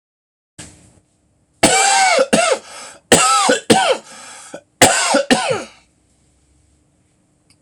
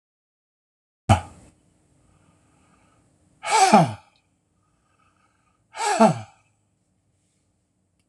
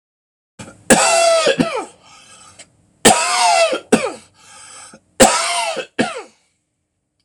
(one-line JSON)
{"cough_length": "7.6 s", "cough_amplitude": 26028, "cough_signal_mean_std_ratio": 0.48, "exhalation_length": "8.1 s", "exhalation_amplitude": 26027, "exhalation_signal_mean_std_ratio": 0.26, "three_cough_length": "7.2 s", "three_cough_amplitude": 26028, "three_cough_signal_mean_std_ratio": 0.49, "survey_phase": "alpha (2021-03-01 to 2021-08-12)", "age": "65+", "gender": "Male", "wearing_mask": "No", "symptom_none": true, "smoker_status": "Ex-smoker", "respiratory_condition_asthma": false, "respiratory_condition_other": false, "recruitment_source": "REACT", "submission_delay": "1 day", "covid_test_result": "Negative", "covid_test_method": "RT-qPCR"}